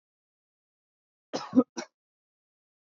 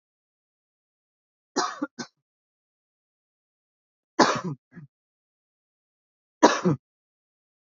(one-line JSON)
{"cough_length": "2.9 s", "cough_amplitude": 10846, "cough_signal_mean_std_ratio": 0.17, "three_cough_length": "7.7 s", "three_cough_amplitude": 27607, "three_cough_signal_mean_std_ratio": 0.21, "survey_phase": "beta (2021-08-13 to 2022-03-07)", "age": "18-44", "gender": "Male", "wearing_mask": "No", "symptom_fatigue": true, "symptom_onset": "6 days", "smoker_status": "Never smoked", "respiratory_condition_asthma": false, "respiratory_condition_other": false, "recruitment_source": "REACT", "submission_delay": "4 days", "covid_test_result": "Negative", "covid_test_method": "RT-qPCR"}